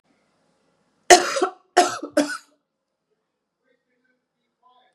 cough_length: 4.9 s
cough_amplitude: 32768
cough_signal_mean_std_ratio: 0.24
survey_phase: beta (2021-08-13 to 2022-03-07)
age: 45-64
gender: Female
wearing_mask: 'No'
symptom_runny_or_blocked_nose: true
symptom_sore_throat: true
symptom_fatigue: true
symptom_headache: true
symptom_onset: 1 day
smoker_status: Never smoked
respiratory_condition_asthma: false
respiratory_condition_other: false
recruitment_source: Test and Trace
submission_delay: 1 day
covid_test_result: Positive
covid_test_method: RT-qPCR
covid_ct_value: 24.4
covid_ct_gene: N gene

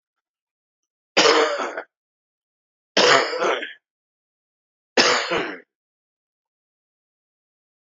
three_cough_length: 7.9 s
three_cough_amplitude: 30803
three_cough_signal_mean_std_ratio: 0.35
survey_phase: beta (2021-08-13 to 2022-03-07)
age: 45-64
gender: Male
wearing_mask: 'No'
symptom_runny_or_blocked_nose: true
symptom_sore_throat: true
symptom_diarrhoea: true
symptom_fatigue: true
symptom_fever_high_temperature: true
symptom_headache: true
symptom_onset: 4 days
smoker_status: Current smoker (1 to 10 cigarettes per day)
respiratory_condition_asthma: false
respiratory_condition_other: false
recruitment_source: Test and Trace
submission_delay: 2 days
covid_test_result: Positive
covid_test_method: ePCR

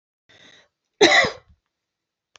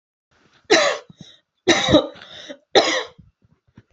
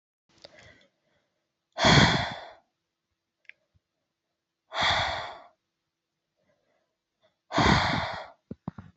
cough_length: 2.4 s
cough_amplitude: 31387
cough_signal_mean_std_ratio: 0.28
three_cough_length: 3.9 s
three_cough_amplitude: 30464
three_cough_signal_mean_std_ratio: 0.39
exhalation_length: 9.0 s
exhalation_amplitude: 16150
exhalation_signal_mean_std_ratio: 0.33
survey_phase: beta (2021-08-13 to 2022-03-07)
age: 18-44
gender: Female
wearing_mask: 'No'
symptom_sore_throat: true
smoker_status: Never smoked
respiratory_condition_asthma: false
respiratory_condition_other: false
recruitment_source: REACT
submission_delay: 2 days
covid_test_result: Negative
covid_test_method: RT-qPCR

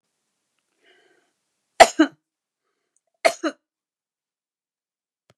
three_cough_length: 5.4 s
three_cough_amplitude: 32768
three_cough_signal_mean_std_ratio: 0.15
survey_phase: beta (2021-08-13 to 2022-03-07)
age: 65+
gender: Female
wearing_mask: 'No'
symptom_none: true
smoker_status: Ex-smoker
respiratory_condition_asthma: false
respiratory_condition_other: false
recruitment_source: REACT
submission_delay: 2 days
covid_test_result: Negative
covid_test_method: RT-qPCR
influenza_a_test_result: Negative
influenza_b_test_result: Negative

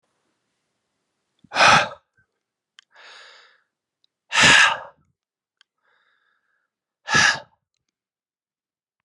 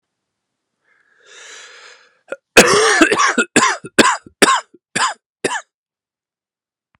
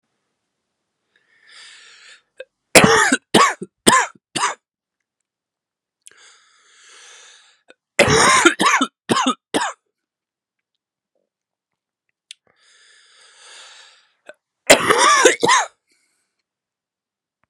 exhalation_length: 9.0 s
exhalation_amplitude: 30323
exhalation_signal_mean_std_ratio: 0.27
cough_length: 7.0 s
cough_amplitude: 32768
cough_signal_mean_std_ratio: 0.38
three_cough_length: 17.5 s
three_cough_amplitude: 32768
three_cough_signal_mean_std_ratio: 0.32
survey_phase: beta (2021-08-13 to 2022-03-07)
age: 18-44
gender: Male
wearing_mask: 'No'
symptom_cough_any: true
symptom_runny_or_blocked_nose: true
symptom_shortness_of_breath: true
symptom_sore_throat: true
symptom_fatigue: true
symptom_headache: true
symptom_change_to_sense_of_smell_or_taste: true
symptom_onset: 3 days
smoker_status: Never smoked
respiratory_condition_asthma: true
respiratory_condition_other: false
recruitment_source: Test and Trace
submission_delay: 2 days
covid_test_result: Positive
covid_test_method: RT-qPCR
covid_ct_value: 12.9
covid_ct_gene: ORF1ab gene
covid_ct_mean: 13.3
covid_viral_load: 43000000 copies/ml
covid_viral_load_category: High viral load (>1M copies/ml)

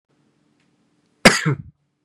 cough_length: 2.0 s
cough_amplitude: 32768
cough_signal_mean_std_ratio: 0.24
survey_phase: beta (2021-08-13 to 2022-03-07)
age: 18-44
gender: Male
wearing_mask: 'No'
symptom_none: true
smoker_status: Current smoker (1 to 10 cigarettes per day)
respiratory_condition_asthma: false
respiratory_condition_other: false
recruitment_source: REACT
submission_delay: 1 day
covid_test_result: Negative
covid_test_method: RT-qPCR
influenza_a_test_result: Negative
influenza_b_test_result: Negative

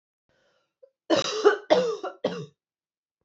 three_cough_length: 3.2 s
three_cough_amplitude: 18118
three_cough_signal_mean_std_ratio: 0.39
survey_phase: beta (2021-08-13 to 2022-03-07)
age: 18-44
gender: Female
wearing_mask: 'No'
symptom_cough_any: true
symptom_runny_or_blocked_nose: true
symptom_shortness_of_breath: true
symptom_sore_throat: true
symptom_fatigue: true
symptom_headache: true
symptom_change_to_sense_of_smell_or_taste: true
symptom_loss_of_taste: true
symptom_other: true
symptom_onset: 2 days
smoker_status: Never smoked
respiratory_condition_asthma: false
respiratory_condition_other: true
recruitment_source: Test and Trace
submission_delay: 2 days
covid_test_result: Positive
covid_test_method: RT-qPCR
covid_ct_value: 20.7
covid_ct_gene: N gene
covid_ct_mean: 20.8
covid_viral_load: 150000 copies/ml
covid_viral_load_category: Low viral load (10K-1M copies/ml)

